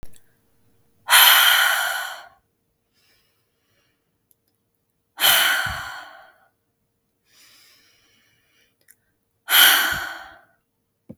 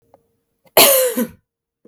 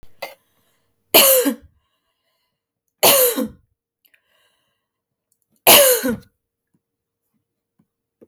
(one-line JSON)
{"exhalation_length": "11.2 s", "exhalation_amplitude": 32768, "exhalation_signal_mean_std_ratio": 0.34, "cough_length": "1.9 s", "cough_amplitude": 32768, "cough_signal_mean_std_ratio": 0.4, "three_cough_length": "8.3 s", "three_cough_amplitude": 32768, "three_cough_signal_mean_std_ratio": 0.31, "survey_phase": "beta (2021-08-13 to 2022-03-07)", "age": "18-44", "gender": "Female", "wearing_mask": "No", "symptom_sore_throat": true, "smoker_status": "Never smoked", "respiratory_condition_asthma": false, "respiratory_condition_other": false, "recruitment_source": "Test and Trace", "submission_delay": "1 day", "covid_test_result": "Negative", "covid_test_method": "RT-qPCR"}